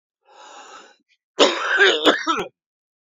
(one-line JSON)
{"three_cough_length": "3.2 s", "three_cough_amplitude": 28978, "three_cough_signal_mean_std_ratio": 0.43, "survey_phase": "beta (2021-08-13 to 2022-03-07)", "age": "45-64", "gender": "Male", "wearing_mask": "No", "symptom_cough_any": true, "symptom_runny_or_blocked_nose": true, "symptom_shortness_of_breath": true, "symptom_headache": true, "smoker_status": "Current smoker (11 or more cigarettes per day)", "respiratory_condition_asthma": false, "respiratory_condition_other": true, "recruitment_source": "REACT", "submission_delay": "1 day", "covid_test_result": "Negative", "covid_test_method": "RT-qPCR", "influenza_a_test_result": "Negative", "influenza_b_test_result": "Negative"}